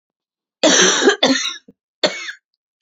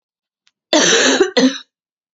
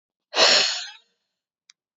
{"three_cough_length": "2.8 s", "three_cough_amplitude": 32767, "three_cough_signal_mean_std_ratio": 0.48, "cough_length": "2.1 s", "cough_amplitude": 32767, "cough_signal_mean_std_ratio": 0.51, "exhalation_length": "2.0 s", "exhalation_amplitude": 22796, "exhalation_signal_mean_std_ratio": 0.38, "survey_phase": "beta (2021-08-13 to 2022-03-07)", "age": "18-44", "gender": "Female", "wearing_mask": "No", "symptom_cough_any": true, "symptom_runny_or_blocked_nose": true, "symptom_fatigue": true, "symptom_headache": true, "symptom_other": true, "symptom_onset": "3 days", "smoker_status": "Never smoked", "respiratory_condition_asthma": true, "respiratory_condition_other": false, "recruitment_source": "Test and Trace", "submission_delay": "2 days", "covid_test_result": "Positive", "covid_test_method": "RT-qPCR", "covid_ct_value": 20.9, "covid_ct_gene": "ORF1ab gene", "covid_ct_mean": 21.5, "covid_viral_load": "87000 copies/ml", "covid_viral_load_category": "Low viral load (10K-1M copies/ml)"}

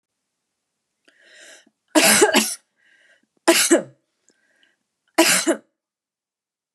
{"three_cough_length": "6.7 s", "three_cough_amplitude": 31342, "three_cough_signal_mean_std_ratio": 0.34, "survey_phase": "beta (2021-08-13 to 2022-03-07)", "age": "65+", "gender": "Female", "wearing_mask": "No", "symptom_none": true, "smoker_status": "Never smoked", "respiratory_condition_asthma": false, "respiratory_condition_other": false, "recruitment_source": "REACT", "submission_delay": "3 days", "covid_test_result": "Negative", "covid_test_method": "RT-qPCR", "influenza_a_test_result": "Negative", "influenza_b_test_result": "Negative"}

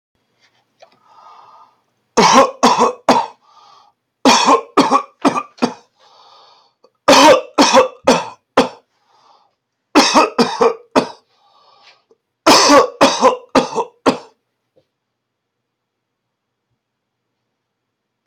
{"cough_length": "18.3 s", "cough_amplitude": 32768, "cough_signal_mean_std_ratio": 0.39, "survey_phase": "beta (2021-08-13 to 2022-03-07)", "age": "65+", "gender": "Male", "wearing_mask": "No", "symptom_shortness_of_breath": true, "symptom_fatigue": true, "smoker_status": "Ex-smoker", "respiratory_condition_asthma": true, "respiratory_condition_other": false, "recruitment_source": "REACT", "submission_delay": "3 days", "covid_test_result": "Negative", "covid_test_method": "RT-qPCR"}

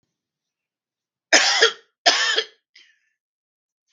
{"cough_length": "3.9 s", "cough_amplitude": 32766, "cough_signal_mean_std_ratio": 0.33, "survey_phase": "beta (2021-08-13 to 2022-03-07)", "age": "45-64", "gender": "Male", "wearing_mask": "No", "symptom_none": true, "smoker_status": "Never smoked", "respiratory_condition_asthma": false, "respiratory_condition_other": false, "recruitment_source": "REACT", "submission_delay": "0 days", "covid_test_result": "Negative", "covid_test_method": "RT-qPCR", "influenza_a_test_result": "Negative", "influenza_b_test_result": "Negative"}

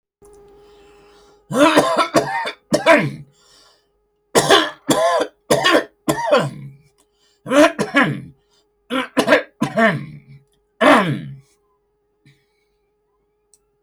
{"cough_length": "13.8 s", "cough_amplitude": 29108, "cough_signal_mean_std_ratio": 0.45, "survey_phase": "alpha (2021-03-01 to 2021-08-12)", "age": "65+", "gender": "Male", "wearing_mask": "No", "symptom_none": true, "smoker_status": "Never smoked", "respiratory_condition_asthma": false, "respiratory_condition_other": false, "recruitment_source": "REACT", "submission_delay": "4 days", "covid_test_result": "Negative", "covid_test_method": "RT-qPCR"}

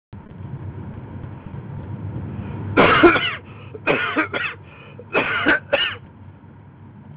{"three_cough_length": "7.2 s", "three_cough_amplitude": 30973, "three_cough_signal_mean_std_ratio": 0.53, "survey_phase": "beta (2021-08-13 to 2022-03-07)", "age": "18-44", "gender": "Male", "wearing_mask": "No", "symptom_runny_or_blocked_nose": true, "symptom_onset": "8 days", "smoker_status": "Never smoked", "respiratory_condition_asthma": false, "respiratory_condition_other": false, "recruitment_source": "REACT", "submission_delay": "1 day", "covid_test_result": "Negative", "covid_test_method": "RT-qPCR", "influenza_a_test_result": "Unknown/Void", "influenza_b_test_result": "Unknown/Void"}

